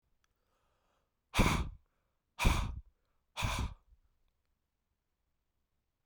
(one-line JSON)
{"exhalation_length": "6.1 s", "exhalation_amplitude": 6534, "exhalation_signal_mean_std_ratio": 0.31, "survey_phase": "beta (2021-08-13 to 2022-03-07)", "age": "45-64", "gender": "Male", "wearing_mask": "No", "symptom_cough_any": true, "symptom_runny_or_blocked_nose": true, "symptom_fatigue": true, "symptom_fever_high_temperature": true, "symptom_change_to_sense_of_smell_or_taste": true, "symptom_loss_of_taste": true, "symptom_onset": "5 days", "smoker_status": "Never smoked", "respiratory_condition_asthma": false, "respiratory_condition_other": false, "recruitment_source": "Test and Trace", "submission_delay": "2 days", "covid_test_result": "Positive", "covid_test_method": "RT-qPCR"}